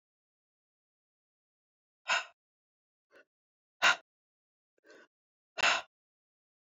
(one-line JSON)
{"exhalation_length": "6.7 s", "exhalation_amplitude": 8236, "exhalation_signal_mean_std_ratio": 0.2, "survey_phase": "beta (2021-08-13 to 2022-03-07)", "age": "45-64", "gender": "Female", "wearing_mask": "No", "symptom_cough_any": true, "symptom_new_continuous_cough": true, "symptom_runny_or_blocked_nose": true, "symptom_shortness_of_breath": true, "symptom_sore_throat": true, "symptom_fatigue": true, "symptom_headache": true, "smoker_status": "Ex-smoker", "respiratory_condition_asthma": false, "respiratory_condition_other": false, "recruitment_source": "Test and Trace", "submission_delay": "2 days", "covid_test_result": "Positive", "covid_test_method": "RT-qPCR", "covid_ct_value": 26.1, "covid_ct_gene": "ORF1ab gene", "covid_ct_mean": 26.5, "covid_viral_load": "2100 copies/ml", "covid_viral_load_category": "Minimal viral load (< 10K copies/ml)"}